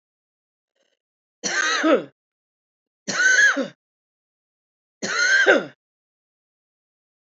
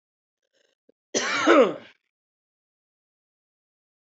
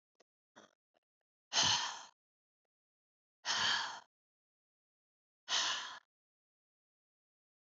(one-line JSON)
{"three_cough_length": "7.3 s", "three_cough_amplitude": 25390, "three_cough_signal_mean_std_ratio": 0.39, "cough_length": "4.1 s", "cough_amplitude": 23441, "cough_signal_mean_std_ratio": 0.27, "exhalation_length": "7.8 s", "exhalation_amplitude": 4336, "exhalation_signal_mean_std_ratio": 0.32, "survey_phase": "beta (2021-08-13 to 2022-03-07)", "age": "45-64", "gender": "Female", "wearing_mask": "No", "symptom_none": true, "smoker_status": "Ex-smoker", "respiratory_condition_asthma": true, "respiratory_condition_other": false, "recruitment_source": "REACT", "submission_delay": "2 days", "covid_test_result": "Negative", "covid_test_method": "RT-qPCR", "influenza_a_test_result": "Negative", "influenza_b_test_result": "Negative"}